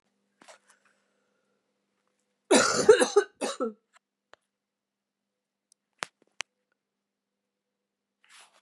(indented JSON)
{
  "cough_length": "8.6 s",
  "cough_amplitude": 19754,
  "cough_signal_mean_std_ratio": 0.21,
  "survey_phase": "beta (2021-08-13 to 2022-03-07)",
  "age": "18-44",
  "gender": "Female",
  "wearing_mask": "No",
  "symptom_new_continuous_cough": true,
  "symptom_runny_or_blocked_nose": true,
  "symptom_fatigue": true,
  "symptom_change_to_sense_of_smell_or_taste": true,
  "symptom_other": true,
  "smoker_status": "Ex-smoker",
  "respiratory_condition_asthma": false,
  "respiratory_condition_other": false,
  "recruitment_source": "Test and Trace",
  "submission_delay": "3 days",
  "covid_test_result": "Positive",
  "covid_test_method": "RT-qPCR",
  "covid_ct_value": 23.3,
  "covid_ct_gene": "ORF1ab gene",
  "covid_ct_mean": 24.0,
  "covid_viral_load": "13000 copies/ml",
  "covid_viral_load_category": "Low viral load (10K-1M copies/ml)"
}